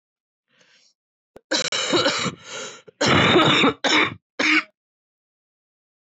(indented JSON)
{
  "cough_length": "6.1 s",
  "cough_amplitude": 18759,
  "cough_signal_mean_std_ratio": 0.48,
  "survey_phase": "beta (2021-08-13 to 2022-03-07)",
  "age": "18-44",
  "gender": "Female",
  "wearing_mask": "Yes",
  "symptom_cough_any": true,
  "symptom_runny_or_blocked_nose": true,
  "symptom_sore_throat": true,
  "symptom_fatigue": true,
  "symptom_headache": true,
  "symptom_change_to_sense_of_smell_or_taste": true,
  "smoker_status": "Current smoker (11 or more cigarettes per day)",
  "respiratory_condition_asthma": true,
  "respiratory_condition_other": false,
  "recruitment_source": "Test and Trace",
  "submission_delay": "3 days",
  "covid_test_result": "Positive",
  "covid_test_method": "RT-qPCR",
  "covid_ct_value": 31.8,
  "covid_ct_gene": "ORF1ab gene",
  "covid_ct_mean": 32.8,
  "covid_viral_load": "17 copies/ml",
  "covid_viral_load_category": "Minimal viral load (< 10K copies/ml)"
}